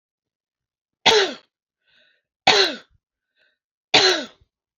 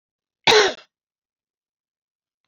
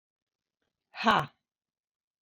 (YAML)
three_cough_length: 4.8 s
three_cough_amplitude: 29248
three_cough_signal_mean_std_ratio: 0.32
cough_length: 2.5 s
cough_amplitude: 29302
cough_signal_mean_std_ratio: 0.25
exhalation_length: 2.2 s
exhalation_amplitude: 13576
exhalation_signal_mean_std_ratio: 0.24
survey_phase: beta (2021-08-13 to 2022-03-07)
age: 45-64
gender: Female
wearing_mask: 'Yes'
symptom_none: true
smoker_status: Never smoked
respiratory_condition_asthma: false
respiratory_condition_other: false
recruitment_source: REACT
submission_delay: 2 days
covid_test_result: Negative
covid_test_method: RT-qPCR